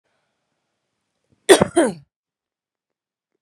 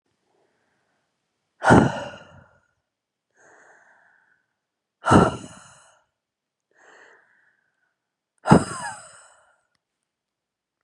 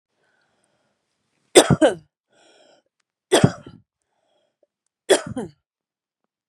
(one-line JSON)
{"cough_length": "3.4 s", "cough_amplitude": 32768, "cough_signal_mean_std_ratio": 0.21, "exhalation_length": "10.8 s", "exhalation_amplitude": 32767, "exhalation_signal_mean_std_ratio": 0.21, "three_cough_length": "6.5 s", "three_cough_amplitude": 32768, "three_cough_signal_mean_std_ratio": 0.22, "survey_phase": "beta (2021-08-13 to 2022-03-07)", "age": "18-44", "gender": "Female", "wearing_mask": "No", "symptom_runny_or_blocked_nose": true, "smoker_status": "Ex-smoker", "respiratory_condition_asthma": false, "respiratory_condition_other": false, "recruitment_source": "REACT", "submission_delay": "1 day", "covid_test_result": "Negative", "covid_test_method": "RT-qPCR", "influenza_a_test_result": "Negative", "influenza_b_test_result": "Negative"}